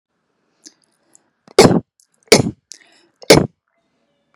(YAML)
three_cough_length: 4.4 s
three_cough_amplitude: 32768
three_cough_signal_mean_std_ratio: 0.25
survey_phase: beta (2021-08-13 to 2022-03-07)
age: 18-44
gender: Female
wearing_mask: 'No'
symptom_fatigue: true
symptom_onset: 12 days
smoker_status: Current smoker (1 to 10 cigarettes per day)
respiratory_condition_asthma: false
respiratory_condition_other: false
recruitment_source: REACT
submission_delay: 3 days
covid_test_result: Negative
covid_test_method: RT-qPCR
influenza_a_test_result: Negative
influenza_b_test_result: Negative